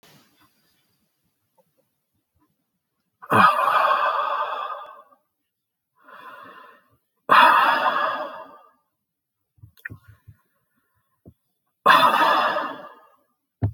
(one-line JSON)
{"exhalation_length": "13.7 s", "exhalation_amplitude": 25261, "exhalation_signal_mean_std_ratio": 0.39, "survey_phase": "alpha (2021-03-01 to 2021-08-12)", "age": "65+", "gender": "Male", "wearing_mask": "No", "symptom_none": true, "symptom_onset": "12 days", "smoker_status": "Ex-smoker", "respiratory_condition_asthma": true, "respiratory_condition_other": false, "recruitment_source": "REACT", "submission_delay": "3 days", "covid_test_result": "Negative", "covid_test_method": "RT-qPCR"}